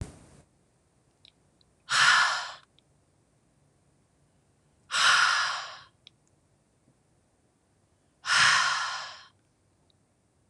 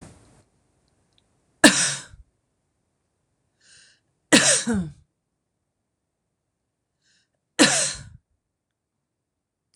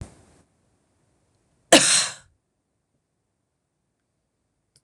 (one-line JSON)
{"exhalation_length": "10.5 s", "exhalation_amplitude": 13619, "exhalation_signal_mean_std_ratio": 0.36, "three_cough_length": "9.8 s", "three_cough_amplitude": 26028, "three_cough_signal_mean_std_ratio": 0.25, "cough_length": "4.8 s", "cough_amplitude": 26028, "cough_signal_mean_std_ratio": 0.2, "survey_phase": "beta (2021-08-13 to 2022-03-07)", "age": "45-64", "gender": "Female", "wearing_mask": "No", "symptom_none": true, "smoker_status": "Ex-smoker", "respiratory_condition_asthma": false, "respiratory_condition_other": false, "recruitment_source": "REACT", "submission_delay": "2 days", "covid_test_result": "Negative", "covid_test_method": "RT-qPCR", "influenza_a_test_result": "Negative", "influenza_b_test_result": "Negative"}